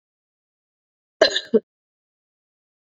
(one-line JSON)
{"cough_length": "2.8 s", "cough_amplitude": 27631, "cough_signal_mean_std_ratio": 0.19, "survey_phase": "beta (2021-08-13 to 2022-03-07)", "age": "45-64", "gender": "Female", "wearing_mask": "No", "symptom_runny_or_blocked_nose": true, "symptom_headache": true, "smoker_status": "Never smoked", "respiratory_condition_asthma": false, "respiratory_condition_other": false, "recruitment_source": "Test and Trace", "submission_delay": "1 day", "covid_test_result": "Positive", "covid_test_method": "ePCR"}